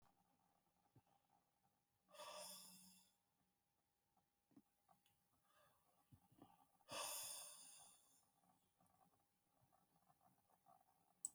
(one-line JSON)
{"exhalation_length": "11.3 s", "exhalation_amplitude": 942, "exhalation_signal_mean_std_ratio": 0.36, "survey_phase": "beta (2021-08-13 to 2022-03-07)", "age": "45-64", "gender": "Male", "wearing_mask": "No", "symptom_none": true, "symptom_onset": "3 days", "smoker_status": "Ex-smoker", "respiratory_condition_asthma": false, "respiratory_condition_other": false, "recruitment_source": "REACT", "submission_delay": "2 days", "covid_test_result": "Negative", "covid_test_method": "RT-qPCR", "influenza_a_test_result": "Unknown/Void", "influenza_b_test_result": "Unknown/Void"}